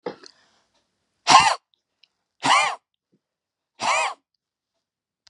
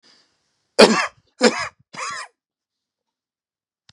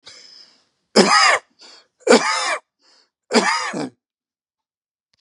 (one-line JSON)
{"exhalation_length": "5.3 s", "exhalation_amplitude": 32410, "exhalation_signal_mean_std_ratio": 0.3, "cough_length": "3.9 s", "cough_amplitude": 32768, "cough_signal_mean_std_ratio": 0.26, "three_cough_length": "5.2 s", "three_cough_amplitude": 32432, "three_cough_signal_mean_std_ratio": 0.39, "survey_phase": "beta (2021-08-13 to 2022-03-07)", "age": "65+", "gender": "Male", "wearing_mask": "No", "symptom_none": true, "smoker_status": "Ex-smoker", "respiratory_condition_asthma": false, "respiratory_condition_other": true, "recruitment_source": "REACT", "submission_delay": "0 days", "covid_test_result": "Negative", "covid_test_method": "RT-qPCR", "influenza_a_test_result": "Negative", "influenza_b_test_result": "Negative"}